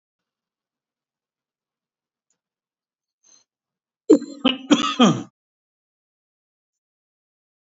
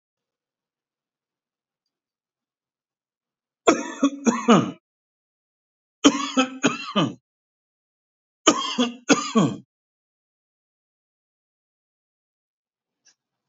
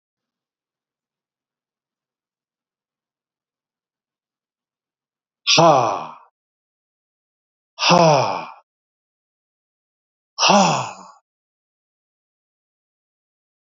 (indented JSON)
{
  "cough_length": "7.7 s",
  "cough_amplitude": 28046,
  "cough_signal_mean_std_ratio": 0.21,
  "three_cough_length": "13.5 s",
  "three_cough_amplitude": 29567,
  "three_cough_signal_mean_std_ratio": 0.28,
  "exhalation_length": "13.7 s",
  "exhalation_amplitude": 28927,
  "exhalation_signal_mean_std_ratio": 0.27,
  "survey_phase": "beta (2021-08-13 to 2022-03-07)",
  "age": "65+",
  "gender": "Male",
  "wearing_mask": "No",
  "symptom_none": true,
  "smoker_status": "Ex-smoker",
  "respiratory_condition_asthma": false,
  "respiratory_condition_other": false,
  "recruitment_source": "REACT",
  "submission_delay": "1 day",
  "covid_test_result": "Negative",
  "covid_test_method": "RT-qPCR"
}